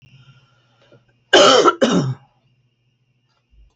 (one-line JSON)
{"cough_length": "3.8 s", "cough_amplitude": 29493, "cough_signal_mean_std_ratio": 0.35, "survey_phase": "beta (2021-08-13 to 2022-03-07)", "age": "65+", "gender": "Female", "wearing_mask": "No", "symptom_none": true, "smoker_status": "Ex-smoker", "respiratory_condition_asthma": false, "respiratory_condition_other": false, "recruitment_source": "REACT", "submission_delay": "2 days", "covid_test_result": "Negative", "covid_test_method": "RT-qPCR"}